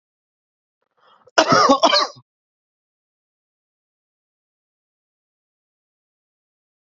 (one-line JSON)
{"cough_length": "7.0 s", "cough_amplitude": 29704, "cough_signal_mean_std_ratio": 0.23, "survey_phase": "beta (2021-08-13 to 2022-03-07)", "age": "18-44", "gender": "Male", "wearing_mask": "No", "symptom_cough_any": true, "symptom_fatigue": true, "symptom_headache": true, "symptom_change_to_sense_of_smell_or_taste": true, "smoker_status": "Current smoker (1 to 10 cigarettes per day)", "respiratory_condition_asthma": false, "respiratory_condition_other": false, "recruitment_source": "Test and Trace", "submission_delay": "3 days", "covid_test_result": "Positive", "covid_test_method": "RT-qPCR", "covid_ct_value": 18.3, "covid_ct_gene": "ORF1ab gene", "covid_ct_mean": 18.9, "covid_viral_load": "630000 copies/ml", "covid_viral_load_category": "Low viral load (10K-1M copies/ml)"}